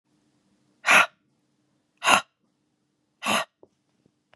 {"exhalation_length": "4.4 s", "exhalation_amplitude": 32767, "exhalation_signal_mean_std_ratio": 0.26, "survey_phase": "beta (2021-08-13 to 2022-03-07)", "age": "45-64", "gender": "Female", "wearing_mask": "No", "symptom_none": true, "smoker_status": "Never smoked", "respiratory_condition_asthma": false, "respiratory_condition_other": false, "recruitment_source": "REACT", "submission_delay": "1 day", "covid_test_result": "Negative", "covid_test_method": "RT-qPCR", "influenza_a_test_result": "Negative", "influenza_b_test_result": "Negative"}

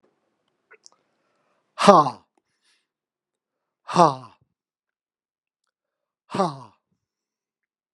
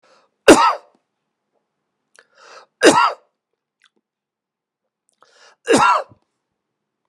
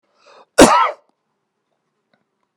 {"exhalation_length": "7.9 s", "exhalation_amplitude": 32768, "exhalation_signal_mean_std_ratio": 0.19, "three_cough_length": "7.1 s", "three_cough_amplitude": 32768, "three_cough_signal_mean_std_ratio": 0.27, "cough_length": "2.6 s", "cough_amplitude": 32768, "cough_signal_mean_std_ratio": 0.27, "survey_phase": "beta (2021-08-13 to 2022-03-07)", "age": "65+", "gender": "Male", "wearing_mask": "No", "symptom_none": true, "smoker_status": "Ex-smoker", "respiratory_condition_asthma": false, "respiratory_condition_other": false, "recruitment_source": "REACT", "submission_delay": "2 days", "covid_test_result": "Negative", "covid_test_method": "RT-qPCR"}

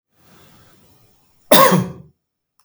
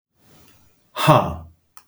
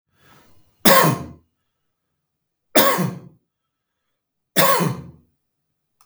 {"cough_length": "2.6 s", "cough_amplitude": 32768, "cough_signal_mean_std_ratio": 0.31, "exhalation_length": "1.9 s", "exhalation_amplitude": 32766, "exhalation_signal_mean_std_ratio": 0.33, "three_cough_length": "6.1 s", "three_cough_amplitude": 32766, "three_cough_signal_mean_std_ratio": 0.33, "survey_phase": "beta (2021-08-13 to 2022-03-07)", "age": "45-64", "gender": "Male", "wearing_mask": "No", "symptom_none": true, "smoker_status": "Never smoked", "respiratory_condition_asthma": false, "respiratory_condition_other": false, "recruitment_source": "REACT", "submission_delay": "1 day", "covid_test_result": "Negative", "covid_test_method": "RT-qPCR"}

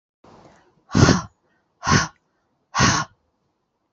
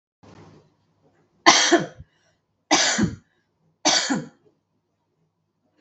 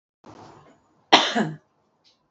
{"exhalation_length": "3.9 s", "exhalation_amplitude": 32124, "exhalation_signal_mean_std_ratio": 0.34, "three_cough_length": "5.8 s", "three_cough_amplitude": 32768, "three_cough_signal_mean_std_ratio": 0.34, "cough_length": "2.3 s", "cough_amplitude": 32580, "cough_signal_mean_std_ratio": 0.28, "survey_phase": "beta (2021-08-13 to 2022-03-07)", "age": "45-64", "gender": "Female", "wearing_mask": "No", "symptom_abdominal_pain": true, "symptom_fatigue": true, "symptom_onset": "12 days", "smoker_status": "Never smoked", "respiratory_condition_asthma": false, "respiratory_condition_other": false, "recruitment_source": "REACT", "submission_delay": "1 day", "covid_test_result": "Negative", "covid_test_method": "RT-qPCR"}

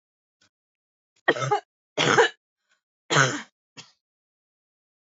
{"three_cough_length": "5.0 s", "three_cough_amplitude": 21644, "three_cough_signal_mean_std_ratio": 0.31, "survey_phase": "alpha (2021-03-01 to 2021-08-12)", "age": "18-44", "gender": "Female", "wearing_mask": "No", "symptom_none": true, "smoker_status": "Current smoker (1 to 10 cigarettes per day)", "respiratory_condition_asthma": true, "respiratory_condition_other": false, "recruitment_source": "REACT", "submission_delay": "2 days", "covid_test_result": "Negative", "covid_test_method": "RT-qPCR"}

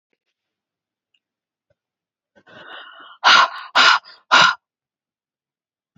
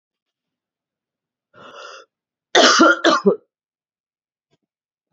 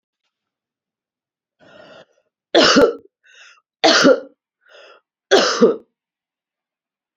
{"exhalation_length": "6.0 s", "exhalation_amplitude": 30588, "exhalation_signal_mean_std_ratio": 0.29, "cough_length": "5.1 s", "cough_amplitude": 32768, "cough_signal_mean_std_ratio": 0.3, "three_cough_length": "7.2 s", "three_cough_amplitude": 29890, "three_cough_signal_mean_std_ratio": 0.32, "survey_phase": "beta (2021-08-13 to 2022-03-07)", "age": "45-64", "gender": "Female", "wearing_mask": "No", "symptom_cough_any": true, "symptom_new_continuous_cough": true, "symptom_runny_or_blocked_nose": true, "symptom_sore_throat": true, "symptom_fatigue": true, "symptom_headache": true, "smoker_status": "Ex-smoker", "respiratory_condition_asthma": false, "respiratory_condition_other": false, "recruitment_source": "Test and Trace", "submission_delay": "2 days", "covid_test_result": "Positive", "covid_test_method": "LFT"}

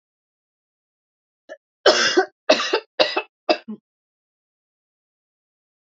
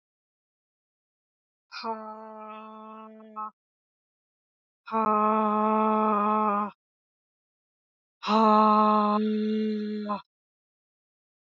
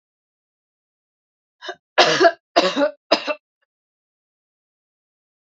{"cough_length": "5.9 s", "cough_amplitude": 28321, "cough_signal_mean_std_ratio": 0.29, "exhalation_length": "11.4 s", "exhalation_amplitude": 13628, "exhalation_signal_mean_std_ratio": 0.46, "three_cough_length": "5.5 s", "three_cough_amplitude": 32767, "three_cough_signal_mean_std_ratio": 0.29, "survey_phase": "alpha (2021-03-01 to 2021-08-12)", "age": "45-64", "gender": "Female", "wearing_mask": "No", "symptom_cough_any": true, "symptom_change_to_sense_of_smell_or_taste": true, "symptom_onset": "4 days", "smoker_status": "Never smoked", "respiratory_condition_asthma": false, "respiratory_condition_other": false, "recruitment_source": "Test and Trace", "submission_delay": "2 days", "covid_test_result": "Positive", "covid_test_method": "RT-qPCR", "covid_ct_value": 27.0, "covid_ct_gene": "ORF1ab gene"}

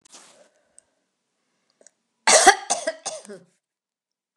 {"cough_length": "4.4 s", "cough_amplitude": 29204, "cough_signal_mean_std_ratio": 0.24, "survey_phase": "beta (2021-08-13 to 2022-03-07)", "age": "65+", "gender": "Female", "wearing_mask": "No", "symptom_runny_or_blocked_nose": true, "symptom_headache": true, "smoker_status": "Never smoked", "respiratory_condition_asthma": false, "respiratory_condition_other": false, "recruitment_source": "Test and Trace", "submission_delay": "2 days", "covid_test_result": "Positive", "covid_test_method": "RT-qPCR"}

